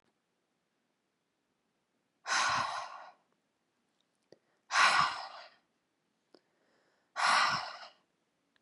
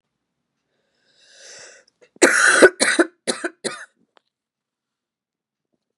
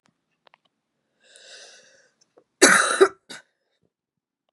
{"exhalation_length": "8.6 s", "exhalation_amplitude": 7641, "exhalation_signal_mean_std_ratio": 0.34, "three_cough_length": "6.0 s", "three_cough_amplitude": 32768, "three_cough_signal_mean_std_ratio": 0.28, "cough_length": "4.5 s", "cough_amplitude": 32767, "cough_signal_mean_std_ratio": 0.24, "survey_phase": "beta (2021-08-13 to 2022-03-07)", "age": "18-44", "gender": "Female", "wearing_mask": "No", "symptom_cough_any": true, "symptom_new_continuous_cough": true, "symptom_sore_throat": true, "symptom_onset": "3 days", "smoker_status": "Never smoked", "respiratory_condition_asthma": false, "respiratory_condition_other": false, "recruitment_source": "Test and Trace", "submission_delay": "2 days", "covid_test_result": "Positive", "covid_test_method": "RT-qPCR", "covid_ct_value": 30.4, "covid_ct_gene": "N gene", "covid_ct_mean": 30.6, "covid_viral_load": "91 copies/ml", "covid_viral_load_category": "Minimal viral load (< 10K copies/ml)"}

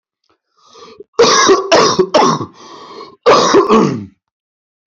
{"cough_length": "4.9 s", "cough_amplitude": 32768, "cough_signal_mean_std_ratio": 0.56, "survey_phase": "beta (2021-08-13 to 2022-03-07)", "age": "18-44", "gender": "Male", "wearing_mask": "No", "symptom_cough_any": true, "symptom_runny_or_blocked_nose": true, "symptom_sore_throat": true, "symptom_headache": true, "symptom_onset": "4 days", "smoker_status": "Never smoked", "respiratory_condition_asthma": false, "respiratory_condition_other": false, "recruitment_source": "Test and Trace", "submission_delay": "2 days", "covid_test_result": "Positive", "covid_test_method": "ePCR"}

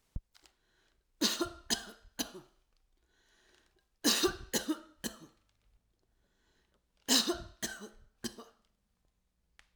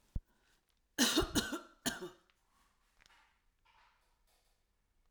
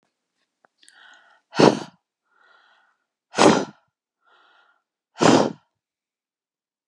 {"three_cough_length": "9.8 s", "three_cough_amplitude": 6646, "three_cough_signal_mean_std_ratio": 0.31, "cough_length": "5.1 s", "cough_amplitude": 6118, "cough_signal_mean_std_ratio": 0.29, "exhalation_length": "6.9 s", "exhalation_amplitude": 32562, "exhalation_signal_mean_std_ratio": 0.25, "survey_phase": "alpha (2021-03-01 to 2021-08-12)", "age": "65+", "gender": "Female", "wearing_mask": "No", "symptom_none": true, "smoker_status": "Never smoked", "respiratory_condition_asthma": false, "respiratory_condition_other": false, "recruitment_source": "REACT", "submission_delay": "1 day", "covid_test_result": "Negative", "covid_test_method": "RT-qPCR"}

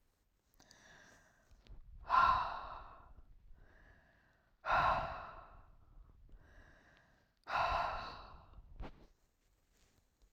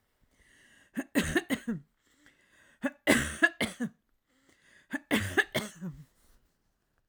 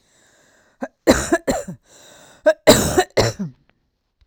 {"exhalation_length": "10.3 s", "exhalation_amplitude": 4512, "exhalation_signal_mean_std_ratio": 0.37, "three_cough_length": "7.1 s", "three_cough_amplitude": 13809, "three_cough_signal_mean_std_ratio": 0.36, "cough_length": "4.3 s", "cough_amplitude": 32768, "cough_signal_mean_std_ratio": 0.37, "survey_phase": "beta (2021-08-13 to 2022-03-07)", "age": "45-64", "gender": "Female", "wearing_mask": "No", "symptom_none": true, "smoker_status": "Never smoked", "respiratory_condition_asthma": false, "respiratory_condition_other": false, "recruitment_source": "REACT", "submission_delay": "12 days", "covid_test_result": "Negative", "covid_test_method": "RT-qPCR"}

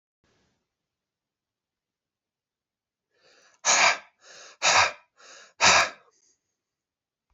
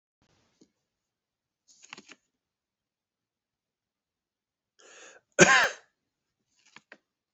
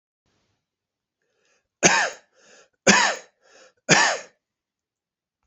{"exhalation_length": "7.3 s", "exhalation_amplitude": 18688, "exhalation_signal_mean_std_ratio": 0.28, "cough_length": "7.3 s", "cough_amplitude": 26158, "cough_signal_mean_std_ratio": 0.16, "three_cough_length": "5.5 s", "three_cough_amplitude": 28616, "three_cough_signal_mean_std_ratio": 0.3, "survey_phase": "beta (2021-08-13 to 2022-03-07)", "age": "65+", "gender": "Male", "wearing_mask": "No", "symptom_none": true, "smoker_status": "Ex-smoker", "respiratory_condition_asthma": false, "respiratory_condition_other": false, "recruitment_source": "REACT", "submission_delay": "2 days", "covid_test_result": "Negative", "covid_test_method": "RT-qPCR"}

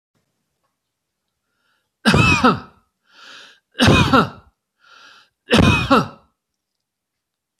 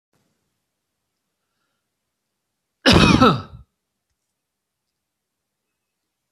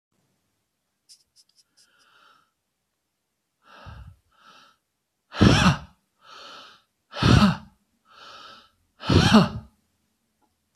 {"three_cough_length": "7.6 s", "three_cough_amplitude": 30389, "three_cough_signal_mean_std_ratio": 0.37, "cough_length": "6.3 s", "cough_amplitude": 26855, "cough_signal_mean_std_ratio": 0.23, "exhalation_length": "10.8 s", "exhalation_amplitude": 24083, "exhalation_signal_mean_std_ratio": 0.28, "survey_phase": "beta (2021-08-13 to 2022-03-07)", "age": "65+", "gender": "Male", "wearing_mask": "No", "symptom_none": true, "smoker_status": "Ex-smoker", "respiratory_condition_asthma": false, "respiratory_condition_other": false, "recruitment_source": "REACT", "submission_delay": "7 days", "covid_test_result": "Negative", "covid_test_method": "RT-qPCR"}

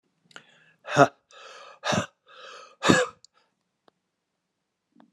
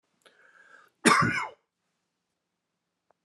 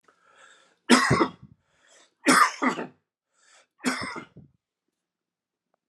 {"exhalation_length": "5.1 s", "exhalation_amplitude": 27575, "exhalation_signal_mean_std_ratio": 0.26, "cough_length": "3.2 s", "cough_amplitude": 18428, "cough_signal_mean_std_ratio": 0.27, "three_cough_length": "5.9 s", "three_cough_amplitude": 25369, "three_cough_signal_mean_std_ratio": 0.32, "survey_phase": "alpha (2021-03-01 to 2021-08-12)", "age": "45-64", "gender": "Male", "wearing_mask": "No", "symptom_fatigue": true, "smoker_status": "Ex-smoker", "respiratory_condition_asthma": false, "respiratory_condition_other": false, "recruitment_source": "Test and Trace", "submission_delay": "2 days", "covid_test_result": "Positive", "covid_test_method": "RT-qPCR", "covid_ct_value": 20.3, "covid_ct_gene": "ORF1ab gene", "covid_ct_mean": 20.5, "covid_viral_load": "190000 copies/ml", "covid_viral_load_category": "Low viral load (10K-1M copies/ml)"}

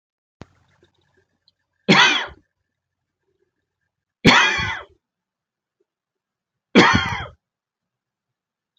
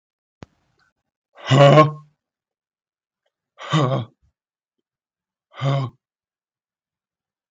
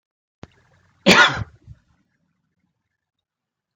{"three_cough_length": "8.8 s", "three_cough_amplitude": 31598, "three_cough_signal_mean_std_ratio": 0.28, "exhalation_length": "7.5 s", "exhalation_amplitude": 32042, "exhalation_signal_mean_std_ratio": 0.27, "cough_length": "3.8 s", "cough_amplitude": 32226, "cough_signal_mean_std_ratio": 0.23, "survey_phase": "beta (2021-08-13 to 2022-03-07)", "age": "65+", "gender": "Male", "wearing_mask": "No", "symptom_none": true, "smoker_status": "Ex-smoker", "respiratory_condition_asthma": false, "respiratory_condition_other": false, "recruitment_source": "REACT", "submission_delay": "2 days", "covid_test_result": "Negative", "covid_test_method": "RT-qPCR", "influenza_a_test_result": "Negative", "influenza_b_test_result": "Negative"}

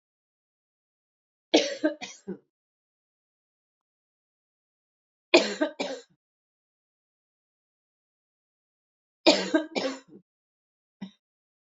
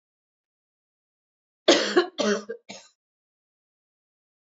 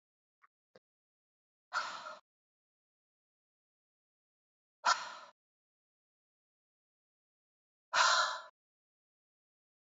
{"three_cough_length": "11.6 s", "three_cough_amplitude": 21241, "three_cough_signal_mean_std_ratio": 0.22, "cough_length": "4.4 s", "cough_amplitude": 24483, "cough_signal_mean_std_ratio": 0.27, "exhalation_length": "9.8 s", "exhalation_amplitude": 6407, "exhalation_signal_mean_std_ratio": 0.22, "survey_phase": "beta (2021-08-13 to 2022-03-07)", "age": "45-64", "gender": "Female", "wearing_mask": "No", "symptom_cough_any": true, "symptom_headache": true, "smoker_status": "Never smoked", "respiratory_condition_asthma": false, "respiratory_condition_other": false, "recruitment_source": "Test and Trace", "submission_delay": "1 day", "covid_test_result": "Positive", "covid_test_method": "RT-qPCR", "covid_ct_value": 21.9, "covid_ct_gene": "ORF1ab gene", "covid_ct_mean": 22.8, "covid_viral_load": "32000 copies/ml", "covid_viral_load_category": "Low viral load (10K-1M copies/ml)"}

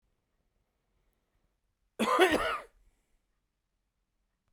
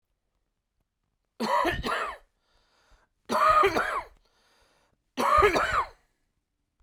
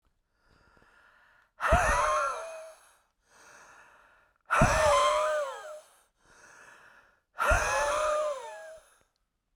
{"cough_length": "4.5 s", "cough_amplitude": 10835, "cough_signal_mean_std_ratio": 0.27, "three_cough_length": "6.8 s", "three_cough_amplitude": 12835, "three_cough_signal_mean_std_ratio": 0.44, "exhalation_length": "9.6 s", "exhalation_amplitude": 11439, "exhalation_signal_mean_std_ratio": 0.49, "survey_phase": "beta (2021-08-13 to 2022-03-07)", "age": "18-44", "gender": "Male", "wearing_mask": "No", "symptom_none": true, "smoker_status": "Never smoked", "respiratory_condition_asthma": false, "respiratory_condition_other": false, "recruitment_source": "REACT", "submission_delay": "1 day", "covid_test_result": "Negative", "covid_test_method": "RT-qPCR"}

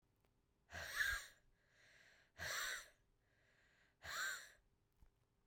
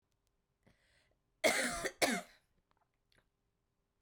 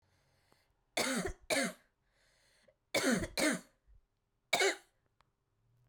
{"exhalation_length": "5.5 s", "exhalation_amplitude": 1160, "exhalation_signal_mean_std_ratio": 0.43, "cough_length": "4.0 s", "cough_amplitude": 4461, "cough_signal_mean_std_ratio": 0.3, "three_cough_length": "5.9 s", "three_cough_amplitude": 4366, "three_cough_signal_mean_std_ratio": 0.39, "survey_phase": "beta (2021-08-13 to 2022-03-07)", "age": "18-44", "gender": "Female", "wearing_mask": "No", "symptom_runny_or_blocked_nose": true, "symptom_sore_throat": true, "symptom_fatigue": true, "symptom_headache": true, "symptom_onset": "6 days", "smoker_status": "Current smoker (e-cigarettes or vapes only)", "respiratory_condition_asthma": false, "respiratory_condition_other": false, "recruitment_source": "Test and Trace", "submission_delay": "2 days", "covid_test_result": "Positive", "covid_test_method": "RT-qPCR", "covid_ct_value": 21.8, "covid_ct_gene": "ORF1ab gene"}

